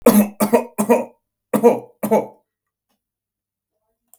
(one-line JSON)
{"three_cough_length": "4.2 s", "three_cough_amplitude": 32768, "three_cough_signal_mean_std_ratio": 0.39, "survey_phase": "beta (2021-08-13 to 2022-03-07)", "age": "45-64", "gender": "Male", "wearing_mask": "No", "symptom_runny_or_blocked_nose": true, "symptom_headache": true, "symptom_onset": "7 days", "smoker_status": "Never smoked", "respiratory_condition_asthma": false, "respiratory_condition_other": false, "recruitment_source": "Test and Trace", "submission_delay": "1 day", "covid_test_result": "Positive", "covid_test_method": "ePCR"}